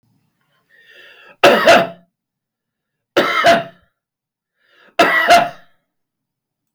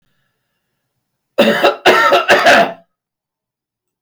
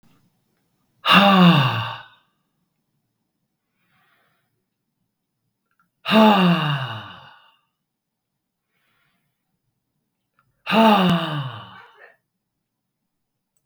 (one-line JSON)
{"three_cough_length": "6.7 s", "three_cough_amplitude": 32768, "three_cough_signal_mean_std_ratio": 0.38, "cough_length": "4.0 s", "cough_amplitude": 32768, "cough_signal_mean_std_ratio": 0.46, "exhalation_length": "13.7 s", "exhalation_amplitude": 32768, "exhalation_signal_mean_std_ratio": 0.34, "survey_phase": "beta (2021-08-13 to 2022-03-07)", "age": "65+", "gender": "Male", "wearing_mask": "No", "symptom_runny_or_blocked_nose": true, "symptom_change_to_sense_of_smell_or_taste": true, "smoker_status": "Never smoked", "respiratory_condition_asthma": false, "respiratory_condition_other": false, "recruitment_source": "REACT", "submission_delay": "9 days", "covid_test_result": "Negative", "covid_test_method": "RT-qPCR", "influenza_a_test_result": "Negative", "influenza_b_test_result": "Negative"}